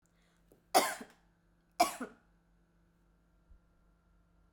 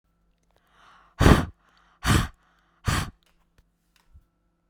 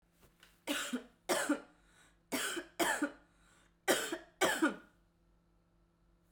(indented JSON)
{
  "cough_length": "4.5 s",
  "cough_amplitude": 8560,
  "cough_signal_mean_std_ratio": 0.22,
  "exhalation_length": "4.7 s",
  "exhalation_amplitude": 32768,
  "exhalation_signal_mean_std_ratio": 0.27,
  "three_cough_length": "6.3 s",
  "three_cough_amplitude": 5910,
  "three_cough_signal_mean_std_ratio": 0.43,
  "survey_phase": "beta (2021-08-13 to 2022-03-07)",
  "age": "18-44",
  "gender": "Female",
  "wearing_mask": "No",
  "symptom_none": true,
  "smoker_status": "Never smoked",
  "respiratory_condition_asthma": false,
  "respiratory_condition_other": false,
  "recruitment_source": "REACT",
  "submission_delay": "1 day",
  "covid_test_result": "Negative",
  "covid_test_method": "RT-qPCR"
}